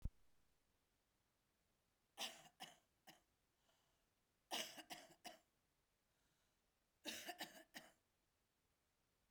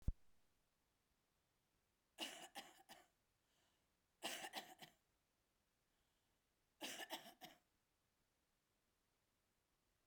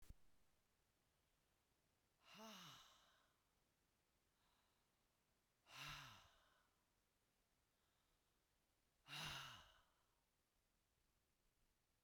three_cough_length: 9.3 s
three_cough_amplitude: 771
three_cough_signal_mean_std_ratio: 0.31
cough_length: 10.1 s
cough_amplitude: 1382
cough_signal_mean_std_ratio: 0.27
exhalation_length: 12.0 s
exhalation_amplitude: 315
exhalation_signal_mean_std_ratio: 0.38
survey_phase: beta (2021-08-13 to 2022-03-07)
age: 45-64
gender: Female
wearing_mask: 'No'
symptom_cough_any: true
symptom_fatigue: true
symptom_onset: 4 days
smoker_status: Current smoker (11 or more cigarettes per day)
respiratory_condition_asthma: false
respiratory_condition_other: true
recruitment_source: REACT
submission_delay: 1 day
covid_test_result: Negative
covid_test_method: RT-qPCR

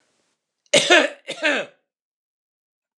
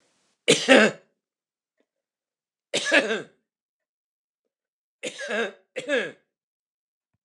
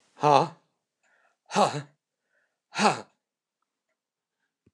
cough_length: 3.0 s
cough_amplitude: 29084
cough_signal_mean_std_ratio: 0.33
three_cough_length: 7.2 s
three_cough_amplitude: 29203
three_cough_signal_mean_std_ratio: 0.3
exhalation_length: 4.7 s
exhalation_amplitude: 19747
exhalation_signal_mean_std_ratio: 0.27
survey_phase: beta (2021-08-13 to 2022-03-07)
age: 65+
gender: Male
wearing_mask: 'No'
symptom_none: true
smoker_status: Never smoked
respiratory_condition_asthma: false
respiratory_condition_other: false
recruitment_source: REACT
submission_delay: 3 days
covid_test_result: Negative
covid_test_method: RT-qPCR
influenza_a_test_result: Negative
influenza_b_test_result: Negative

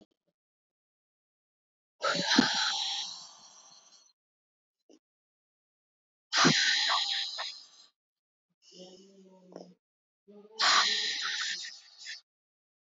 exhalation_length: 12.9 s
exhalation_amplitude: 10959
exhalation_signal_mean_std_ratio: 0.4
survey_phase: beta (2021-08-13 to 2022-03-07)
age: 18-44
gender: Female
wearing_mask: 'No'
symptom_cough_any: true
symptom_runny_or_blocked_nose: true
symptom_sore_throat: true
symptom_fatigue: true
symptom_headache: true
symptom_other: true
symptom_onset: 7 days
smoker_status: Never smoked
respiratory_condition_asthma: false
respiratory_condition_other: false
recruitment_source: Test and Trace
submission_delay: 2 days
covid_test_result: Positive
covid_test_method: RT-qPCR
covid_ct_value: 19.8
covid_ct_gene: N gene
covid_ct_mean: 20.3
covid_viral_load: 220000 copies/ml
covid_viral_load_category: Low viral load (10K-1M copies/ml)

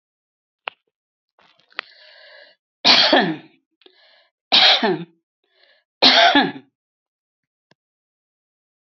three_cough_length: 9.0 s
three_cough_amplitude: 31835
three_cough_signal_mean_std_ratio: 0.32
survey_phase: alpha (2021-03-01 to 2021-08-12)
age: 65+
gender: Female
wearing_mask: 'No'
symptom_none: true
smoker_status: Never smoked
respiratory_condition_asthma: false
respiratory_condition_other: false
recruitment_source: REACT
submission_delay: 1 day
covid_test_result: Negative
covid_test_method: RT-qPCR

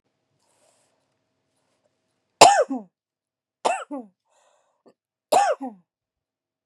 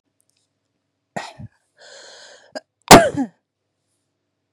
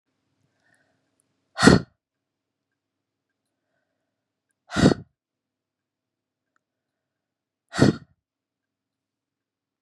three_cough_length: 6.7 s
three_cough_amplitude: 32768
three_cough_signal_mean_std_ratio: 0.23
cough_length: 4.5 s
cough_amplitude: 32768
cough_signal_mean_std_ratio: 0.19
exhalation_length: 9.8 s
exhalation_amplitude: 32768
exhalation_signal_mean_std_ratio: 0.17
survey_phase: beta (2021-08-13 to 2022-03-07)
age: 45-64
gender: Female
wearing_mask: 'No'
symptom_runny_or_blocked_nose: true
symptom_sore_throat: true
symptom_abdominal_pain: true
symptom_diarrhoea: true
symptom_fatigue: true
symptom_fever_high_temperature: true
symptom_headache: true
symptom_change_to_sense_of_smell_or_taste: true
symptom_onset: 5 days
smoker_status: Current smoker (1 to 10 cigarettes per day)
respiratory_condition_asthma: false
respiratory_condition_other: false
recruitment_source: Test and Trace
submission_delay: 1 day
covid_test_result: Positive
covid_test_method: RT-qPCR
covid_ct_value: 16.7
covid_ct_gene: ORF1ab gene
covid_ct_mean: 17.3
covid_viral_load: 2100000 copies/ml
covid_viral_load_category: High viral load (>1M copies/ml)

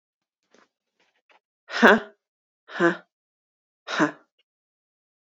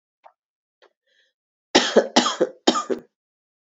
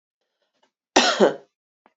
exhalation_length: 5.3 s
exhalation_amplitude: 27322
exhalation_signal_mean_std_ratio: 0.24
three_cough_length: 3.7 s
three_cough_amplitude: 27476
three_cough_signal_mean_std_ratio: 0.32
cough_length: 2.0 s
cough_amplitude: 27213
cough_signal_mean_std_ratio: 0.31
survey_phase: beta (2021-08-13 to 2022-03-07)
age: 18-44
gender: Female
wearing_mask: 'No'
symptom_cough_any: true
symptom_runny_or_blocked_nose: true
symptom_sore_throat: true
symptom_fatigue: true
smoker_status: Never smoked
respiratory_condition_asthma: false
respiratory_condition_other: false
recruitment_source: Test and Trace
submission_delay: 1 day
covid_test_result: Positive
covid_test_method: ePCR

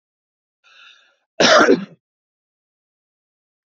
cough_length: 3.7 s
cough_amplitude: 30322
cough_signal_mean_std_ratio: 0.27
survey_phase: beta (2021-08-13 to 2022-03-07)
age: 18-44
gender: Male
wearing_mask: 'No'
symptom_none: true
smoker_status: Never smoked
respiratory_condition_asthma: false
respiratory_condition_other: false
recruitment_source: REACT
submission_delay: 38 days
covid_test_result: Negative
covid_test_method: RT-qPCR
influenza_a_test_result: Negative
influenza_b_test_result: Negative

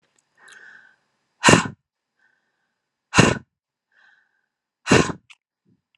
exhalation_length: 6.0 s
exhalation_amplitude: 32685
exhalation_signal_mean_std_ratio: 0.24
survey_phase: alpha (2021-03-01 to 2021-08-12)
age: 18-44
gender: Female
wearing_mask: 'No'
symptom_none: true
smoker_status: Ex-smoker
respiratory_condition_asthma: false
respiratory_condition_other: false
recruitment_source: REACT
submission_delay: 1 day
covid_test_result: Negative
covid_test_method: RT-qPCR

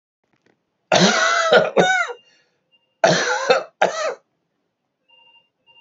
cough_length: 5.8 s
cough_amplitude: 30990
cough_signal_mean_std_ratio: 0.47
survey_phase: beta (2021-08-13 to 2022-03-07)
age: 45-64
gender: Male
wearing_mask: 'No'
symptom_cough_any: true
symptom_runny_or_blocked_nose: true
symptom_shortness_of_breath: true
symptom_sore_throat: true
symptom_fatigue: true
symptom_onset: 5 days
smoker_status: Never smoked
respiratory_condition_asthma: false
respiratory_condition_other: false
recruitment_source: Test and Trace
submission_delay: 2 days
covid_test_result: Positive
covid_test_method: ePCR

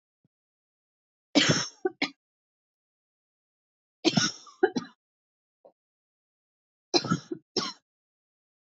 three_cough_length: 8.8 s
three_cough_amplitude: 14200
three_cough_signal_mean_std_ratio: 0.26
survey_phase: beta (2021-08-13 to 2022-03-07)
age: 18-44
gender: Female
wearing_mask: 'No'
symptom_cough_any: true
symptom_shortness_of_breath: true
symptom_sore_throat: true
symptom_abdominal_pain: true
symptom_diarrhoea: true
symptom_fatigue: true
symptom_headache: true
symptom_onset: 4 days
smoker_status: Never smoked
respiratory_condition_asthma: false
respiratory_condition_other: false
recruitment_source: Test and Trace
submission_delay: 2 days
covid_test_result: Positive
covid_test_method: RT-qPCR
covid_ct_value: 26.6
covid_ct_gene: ORF1ab gene
covid_ct_mean: 27.0
covid_viral_load: 1400 copies/ml
covid_viral_load_category: Minimal viral load (< 10K copies/ml)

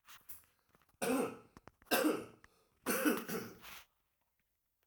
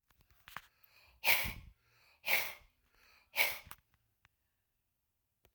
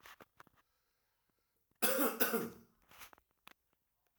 three_cough_length: 4.9 s
three_cough_amplitude: 3959
three_cough_signal_mean_std_ratio: 0.43
exhalation_length: 5.5 s
exhalation_amplitude: 6645
exhalation_signal_mean_std_ratio: 0.29
cough_length: 4.2 s
cough_amplitude: 5063
cough_signal_mean_std_ratio: 0.32
survey_phase: alpha (2021-03-01 to 2021-08-12)
age: 45-64
gender: Male
wearing_mask: 'No'
symptom_none: true
smoker_status: Current smoker (1 to 10 cigarettes per day)
respiratory_condition_asthma: false
respiratory_condition_other: false
recruitment_source: REACT
submission_delay: 4 days
covid_test_result: Negative
covid_test_method: RT-qPCR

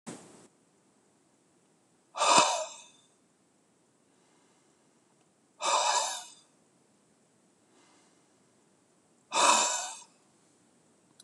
exhalation_length: 11.2 s
exhalation_amplitude: 13123
exhalation_signal_mean_std_ratio: 0.31
survey_phase: beta (2021-08-13 to 2022-03-07)
age: 45-64
gender: Male
wearing_mask: 'No'
symptom_cough_any: true
symptom_runny_or_blocked_nose: true
symptom_fever_high_temperature: true
symptom_onset: 4 days
smoker_status: Never smoked
respiratory_condition_asthma: false
respiratory_condition_other: false
recruitment_source: Test and Trace
submission_delay: 2 days
covid_test_result: Positive
covid_test_method: RT-qPCR
covid_ct_value: 15.8
covid_ct_gene: ORF1ab gene
covid_ct_mean: 16.2
covid_viral_load: 4800000 copies/ml
covid_viral_load_category: High viral load (>1M copies/ml)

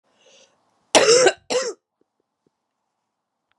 cough_length: 3.6 s
cough_amplitude: 32167
cough_signal_mean_std_ratio: 0.31
survey_phase: beta (2021-08-13 to 2022-03-07)
age: 45-64
gender: Female
wearing_mask: 'No'
symptom_cough_any: true
symptom_new_continuous_cough: true
symptom_runny_or_blocked_nose: true
symptom_shortness_of_breath: true
symptom_sore_throat: true
symptom_headache: true
symptom_onset: 3 days
smoker_status: Never smoked
respiratory_condition_asthma: false
respiratory_condition_other: false
recruitment_source: Test and Trace
submission_delay: 1 day
covid_test_result: Positive
covid_test_method: RT-qPCR
covid_ct_value: 23.1
covid_ct_gene: ORF1ab gene
covid_ct_mean: 23.9
covid_viral_load: 15000 copies/ml
covid_viral_load_category: Low viral load (10K-1M copies/ml)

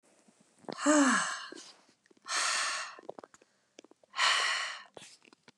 exhalation_length: 5.6 s
exhalation_amplitude: 7192
exhalation_signal_mean_std_ratio: 0.47
survey_phase: beta (2021-08-13 to 2022-03-07)
age: 18-44
gender: Female
wearing_mask: 'No'
symptom_cough_any: true
symptom_runny_or_blocked_nose: true
symptom_sore_throat: true
symptom_fatigue: true
symptom_headache: true
symptom_onset: 5 days
smoker_status: Never smoked
respiratory_condition_asthma: true
respiratory_condition_other: false
recruitment_source: Test and Trace
submission_delay: 1 day
covid_test_result: Positive
covid_test_method: RT-qPCR
covid_ct_value: 20.1
covid_ct_gene: N gene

